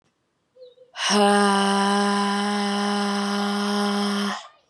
{"exhalation_length": "4.7 s", "exhalation_amplitude": 17597, "exhalation_signal_mean_std_ratio": 0.82, "survey_phase": "beta (2021-08-13 to 2022-03-07)", "age": "18-44", "gender": "Female", "wearing_mask": "No", "symptom_cough_any": true, "symptom_new_continuous_cough": true, "symptom_shortness_of_breath": true, "symptom_fatigue": true, "symptom_headache": true, "symptom_change_to_sense_of_smell_or_taste": true, "symptom_loss_of_taste": true, "symptom_onset": "7 days", "smoker_status": "Never smoked", "respiratory_condition_asthma": false, "respiratory_condition_other": false, "recruitment_source": "Test and Trace", "submission_delay": "2 days", "covid_test_result": "Positive", "covid_test_method": "RT-qPCR"}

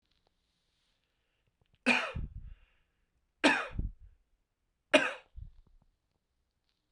{"three_cough_length": "6.9 s", "three_cough_amplitude": 13115, "three_cough_signal_mean_std_ratio": 0.27, "survey_phase": "beta (2021-08-13 to 2022-03-07)", "age": "18-44", "gender": "Male", "wearing_mask": "No", "symptom_cough_any": true, "symptom_runny_or_blocked_nose": true, "symptom_fatigue": true, "symptom_change_to_sense_of_smell_or_taste": true, "symptom_onset": "5 days", "smoker_status": "Never smoked", "respiratory_condition_asthma": false, "respiratory_condition_other": false, "recruitment_source": "Test and Trace", "submission_delay": "2 days", "covid_test_result": "Positive", "covid_test_method": "LAMP"}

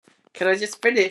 {"three_cough_length": "1.1 s", "three_cough_amplitude": 20483, "three_cough_signal_mean_std_ratio": 0.57, "survey_phase": "beta (2021-08-13 to 2022-03-07)", "age": "18-44", "gender": "Female", "wearing_mask": "No", "symptom_new_continuous_cough": true, "symptom_runny_or_blocked_nose": true, "symptom_shortness_of_breath": true, "symptom_sore_throat": true, "symptom_headache": true, "symptom_other": true, "smoker_status": "Ex-smoker", "respiratory_condition_asthma": false, "respiratory_condition_other": false, "recruitment_source": "Test and Trace", "submission_delay": "1 day", "covid_test_result": "Positive", "covid_test_method": "LFT"}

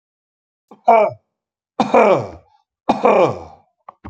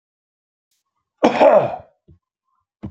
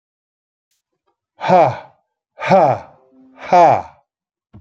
{"three_cough_length": "4.1 s", "three_cough_amplitude": 29121, "three_cough_signal_mean_std_ratio": 0.41, "cough_length": "2.9 s", "cough_amplitude": 32767, "cough_signal_mean_std_ratio": 0.32, "exhalation_length": "4.6 s", "exhalation_amplitude": 28541, "exhalation_signal_mean_std_ratio": 0.37, "survey_phase": "beta (2021-08-13 to 2022-03-07)", "age": "45-64", "gender": "Male", "wearing_mask": "No", "symptom_none": true, "smoker_status": "Ex-smoker", "respiratory_condition_asthma": false, "respiratory_condition_other": false, "recruitment_source": "REACT", "submission_delay": "4 days", "covid_test_result": "Negative", "covid_test_method": "RT-qPCR", "influenza_a_test_result": "Unknown/Void", "influenza_b_test_result": "Unknown/Void"}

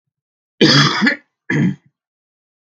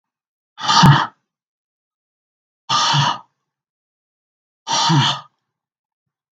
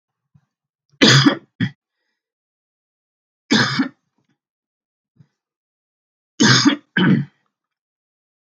{"cough_length": "2.7 s", "cough_amplitude": 32768, "cough_signal_mean_std_ratio": 0.43, "exhalation_length": "6.4 s", "exhalation_amplitude": 32768, "exhalation_signal_mean_std_ratio": 0.37, "three_cough_length": "8.5 s", "three_cough_amplitude": 32768, "three_cough_signal_mean_std_ratio": 0.32, "survey_phase": "beta (2021-08-13 to 2022-03-07)", "age": "45-64", "gender": "Male", "wearing_mask": "No", "symptom_cough_any": true, "symptom_runny_or_blocked_nose": true, "symptom_sore_throat": true, "symptom_fatigue": true, "symptom_onset": "4 days", "smoker_status": "Ex-smoker", "respiratory_condition_asthma": false, "respiratory_condition_other": false, "recruitment_source": "Test and Trace", "submission_delay": "1 day", "covid_test_result": "Positive", "covid_test_method": "RT-qPCR", "covid_ct_value": 18.4, "covid_ct_gene": "ORF1ab gene", "covid_ct_mean": 19.1, "covid_viral_load": "560000 copies/ml", "covid_viral_load_category": "Low viral load (10K-1M copies/ml)"}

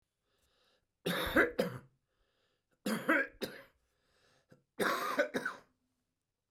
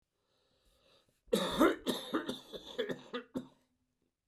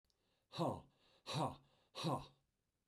{"three_cough_length": "6.5 s", "three_cough_amplitude": 6254, "three_cough_signal_mean_std_ratio": 0.39, "cough_length": "4.3 s", "cough_amplitude": 6591, "cough_signal_mean_std_ratio": 0.39, "exhalation_length": "2.9 s", "exhalation_amplitude": 1388, "exhalation_signal_mean_std_ratio": 0.42, "survey_phase": "beta (2021-08-13 to 2022-03-07)", "age": "65+", "gender": "Male", "wearing_mask": "No", "symptom_cough_any": true, "symptom_onset": "7 days", "smoker_status": "Never smoked", "respiratory_condition_asthma": false, "respiratory_condition_other": false, "recruitment_source": "REACT", "submission_delay": "2 days", "covid_test_result": "Negative", "covid_test_method": "RT-qPCR", "influenza_a_test_result": "Unknown/Void", "influenza_b_test_result": "Unknown/Void"}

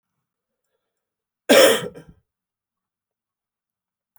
{"cough_length": "4.2 s", "cough_amplitude": 32644, "cough_signal_mean_std_ratio": 0.22, "survey_phase": "beta (2021-08-13 to 2022-03-07)", "age": "65+", "gender": "Male", "wearing_mask": "No", "symptom_cough_any": true, "symptom_runny_or_blocked_nose": true, "symptom_fever_high_temperature": true, "symptom_headache": true, "symptom_onset": "3 days", "smoker_status": "Never smoked", "respiratory_condition_asthma": false, "respiratory_condition_other": false, "recruitment_source": "Test and Trace", "submission_delay": "2 days", "covid_test_result": "Positive", "covid_test_method": "RT-qPCR"}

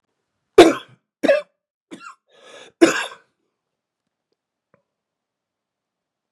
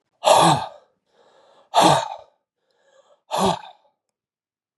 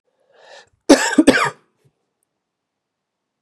{"three_cough_length": "6.3 s", "three_cough_amplitude": 32768, "three_cough_signal_mean_std_ratio": 0.21, "exhalation_length": "4.8 s", "exhalation_amplitude": 28646, "exhalation_signal_mean_std_ratio": 0.36, "cough_length": "3.4 s", "cough_amplitude": 32768, "cough_signal_mean_std_ratio": 0.27, "survey_phase": "beta (2021-08-13 to 2022-03-07)", "age": "45-64", "gender": "Male", "wearing_mask": "No", "symptom_none": true, "smoker_status": "Never smoked", "respiratory_condition_asthma": false, "respiratory_condition_other": false, "recruitment_source": "REACT", "submission_delay": "1 day", "covid_test_result": "Negative", "covid_test_method": "RT-qPCR", "influenza_a_test_result": "Negative", "influenza_b_test_result": "Negative"}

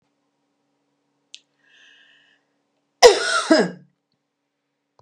{"cough_length": "5.0 s", "cough_amplitude": 32768, "cough_signal_mean_std_ratio": 0.23, "survey_phase": "beta (2021-08-13 to 2022-03-07)", "age": "65+", "gender": "Female", "wearing_mask": "No", "symptom_none": true, "smoker_status": "Never smoked", "respiratory_condition_asthma": false, "respiratory_condition_other": false, "recruitment_source": "REACT", "submission_delay": "1 day", "covid_test_result": "Negative", "covid_test_method": "RT-qPCR", "influenza_a_test_result": "Negative", "influenza_b_test_result": "Negative"}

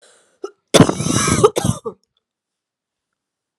{"cough_length": "3.6 s", "cough_amplitude": 32768, "cough_signal_mean_std_ratio": 0.35, "survey_phase": "alpha (2021-03-01 to 2021-08-12)", "age": "45-64", "gender": "Female", "wearing_mask": "No", "symptom_cough_any": true, "symptom_shortness_of_breath": true, "symptom_fatigue": true, "symptom_fever_high_temperature": true, "symptom_headache": true, "symptom_change_to_sense_of_smell_or_taste": true, "symptom_loss_of_taste": true, "smoker_status": "Never smoked", "respiratory_condition_asthma": true, "respiratory_condition_other": false, "recruitment_source": "Test and Trace", "submission_delay": "1 day", "covid_test_result": "Positive", "covid_test_method": "RT-qPCR"}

